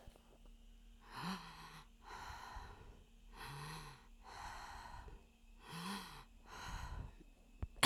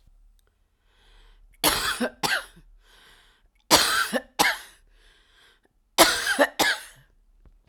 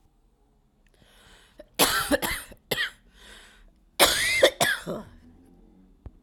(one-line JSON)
{"exhalation_length": "7.9 s", "exhalation_amplitude": 5984, "exhalation_signal_mean_std_ratio": 0.58, "three_cough_length": "7.7 s", "three_cough_amplitude": 32767, "three_cough_signal_mean_std_ratio": 0.38, "cough_length": "6.2 s", "cough_amplitude": 23024, "cough_signal_mean_std_ratio": 0.39, "survey_phase": "alpha (2021-03-01 to 2021-08-12)", "age": "45-64", "gender": "Female", "wearing_mask": "No", "symptom_cough_any": true, "symptom_diarrhoea": true, "symptom_fatigue": true, "smoker_status": "Current smoker (1 to 10 cigarettes per day)", "respiratory_condition_asthma": false, "respiratory_condition_other": false, "recruitment_source": "REACT", "submission_delay": "2 days", "covid_test_result": "Negative", "covid_test_method": "RT-qPCR"}